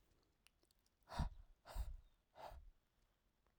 {"exhalation_length": "3.6 s", "exhalation_amplitude": 1103, "exhalation_signal_mean_std_ratio": 0.36, "survey_phase": "alpha (2021-03-01 to 2021-08-12)", "age": "18-44", "gender": "Male", "wearing_mask": "No", "symptom_none": true, "smoker_status": "Never smoked", "respiratory_condition_asthma": false, "respiratory_condition_other": false, "recruitment_source": "REACT", "submission_delay": "1 day", "covid_test_result": "Negative", "covid_test_method": "RT-qPCR"}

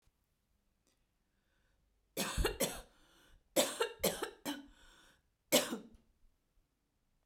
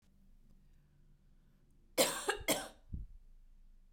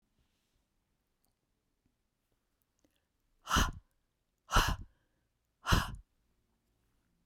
{"three_cough_length": "7.3 s", "three_cough_amplitude": 6268, "three_cough_signal_mean_std_ratio": 0.33, "cough_length": "3.9 s", "cough_amplitude": 5763, "cough_signal_mean_std_ratio": 0.36, "exhalation_length": "7.3 s", "exhalation_amplitude": 7893, "exhalation_signal_mean_std_ratio": 0.24, "survey_phase": "beta (2021-08-13 to 2022-03-07)", "age": "45-64", "gender": "Female", "wearing_mask": "No", "symptom_abdominal_pain": true, "symptom_diarrhoea": true, "symptom_other": true, "smoker_status": "Never smoked", "respiratory_condition_asthma": false, "respiratory_condition_other": false, "recruitment_source": "Test and Trace", "submission_delay": "1 day", "covid_test_result": "Positive", "covid_test_method": "RT-qPCR", "covid_ct_value": 17.1, "covid_ct_gene": "ORF1ab gene", "covid_ct_mean": 17.4, "covid_viral_load": "1900000 copies/ml", "covid_viral_load_category": "High viral load (>1M copies/ml)"}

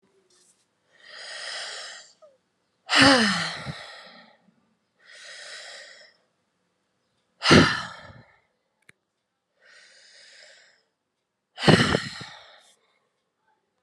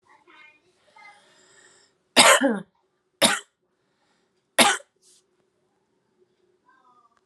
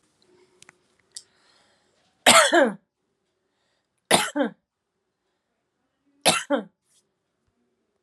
{"exhalation_length": "13.8 s", "exhalation_amplitude": 28057, "exhalation_signal_mean_std_ratio": 0.27, "cough_length": "7.3 s", "cough_amplitude": 28471, "cough_signal_mean_std_ratio": 0.24, "three_cough_length": "8.0 s", "three_cough_amplitude": 29029, "three_cough_signal_mean_std_ratio": 0.26, "survey_phase": "alpha (2021-03-01 to 2021-08-12)", "age": "18-44", "gender": "Female", "wearing_mask": "No", "symptom_none": true, "smoker_status": "Current smoker (11 or more cigarettes per day)", "respiratory_condition_asthma": true, "respiratory_condition_other": false, "recruitment_source": "REACT", "submission_delay": "2 days", "covid_test_result": "Negative", "covid_test_method": "RT-qPCR"}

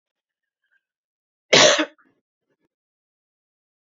{"cough_length": "3.8 s", "cough_amplitude": 32206, "cough_signal_mean_std_ratio": 0.22, "survey_phase": "beta (2021-08-13 to 2022-03-07)", "age": "18-44", "gender": "Female", "wearing_mask": "No", "symptom_none": true, "smoker_status": "Never smoked", "respiratory_condition_asthma": false, "respiratory_condition_other": false, "recruitment_source": "REACT", "submission_delay": "2 days", "covid_test_result": "Negative", "covid_test_method": "RT-qPCR", "influenza_a_test_result": "Negative", "influenza_b_test_result": "Negative"}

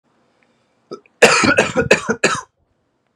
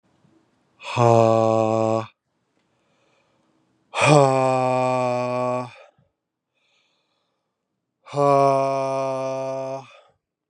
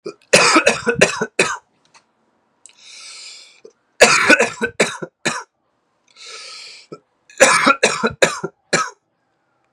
{"cough_length": "3.2 s", "cough_amplitude": 32768, "cough_signal_mean_std_ratio": 0.41, "exhalation_length": "10.5 s", "exhalation_amplitude": 29709, "exhalation_signal_mean_std_ratio": 0.48, "three_cough_length": "9.7 s", "three_cough_amplitude": 32768, "three_cough_signal_mean_std_ratio": 0.4, "survey_phase": "beta (2021-08-13 to 2022-03-07)", "age": "45-64", "gender": "Male", "wearing_mask": "No", "symptom_cough_any": true, "symptom_runny_or_blocked_nose": true, "symptom_shortness_of_breath": true, "symptom_sore_throat": true, "symptom_fatigue": true, "symptom_headache": true, "symptom_change_to_sense_of_smell_or_taste": true, "symptom_onset": "3 days", "smoker_status": "Ex-smoker", "respiratory_condition_asthma": false, "respiratory_condition_other": false, "recruitment_source": "Test and Trace", "submission_delay": "1 day", "covid_test_result": "Positive", "covid_test_method": "RT-qPCR"}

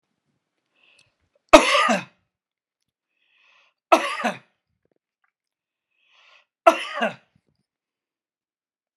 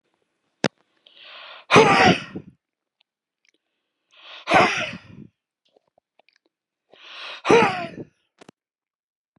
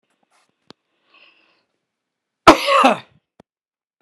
{"three_cough_length": "9.0 s", "three_cough_amplitude": 32768, "three_cough_signal_mean_std_ratio": 0.22, "exhalation_length": "9.4 s", "exhalation_amplitude": 31091, "exhalation_signal_mean_std_ratio": 0.3, "cough_length": "4.0 s", "cough_amplitude": 32768, "cough_signal_mean_std_ratio": 0.23, "survey_phase": "beta (2021-08-13 to 2022-03-07)", "age": "65+", "gender": "Male", "wearing_mask": "No", "symptom_none": true, "smoker_status": "Never smoked", "respiratory_condition_asthma": false, "respiratory_condition_other": false, "recruitment_source": "REACT", "submission_delay": "1 day", "covid_test_result": "Negative", "covid_test_method": "RT-qPCR"}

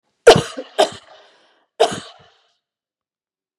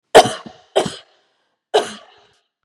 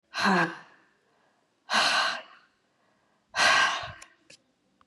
{"cough_length": "3.6 s", "cough_amplitude": 32768, "cough_signal_mean_std_ratio": 0.24, "three_cough_length": "2.6 s", "three_cough_amplitude": 32768, "three_cough_signal_mean_std_ratio": 0.27, "exhalation_length": "4.9 s", "exhalation_amplitude": 10675, "exhalation_signal_mean_std_ratio": 0.44, "survey_phase": "beta (2021-08-13 to 2022-03-07)", "age": "45-64", "gender": "Female", "wearing_mask": "No", "symptom_none": true, "smoker_status": "Never smoked", "respiratory_condition_asthma": false, "respiratory_condition_other": false, "recruitment_source": "REACT", "submission_delay": "1 day", "covid_test_result": "Negative", "covid_test_method": "RT-qPCR"}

